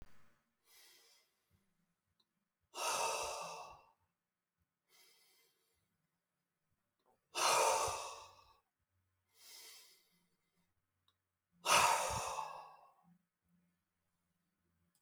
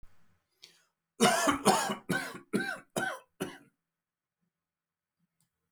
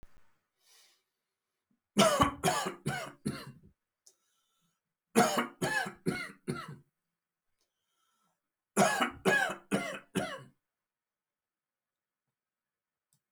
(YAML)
exhalation_length: 15.0 s
exhalation_amplitude: 4830
exhalation_signal_mean_std_ratio: 0.31
cough_length: 5.7 s
cough_amplitude: 12244
cough_signal_mean_std_ratio: 0.37
three_cough_length: 13.3 s
three_cough_amplitude: 10897
three_cough_signal_mean_std_ratio: 0.35
survey_phase: beta (2021-08-13 to 2022-03-07)
age: 65+
gender: Male
wearing_mask: 'No'
symptom_none: true
smoker_status: Ex-smoker
respiratory_condition_asthma: false
respiratory_condition_other: false
recruitment_source: REACT
submission_delay: 3 days
covid_test_result: Negative
covid_test_method: RT-qPCR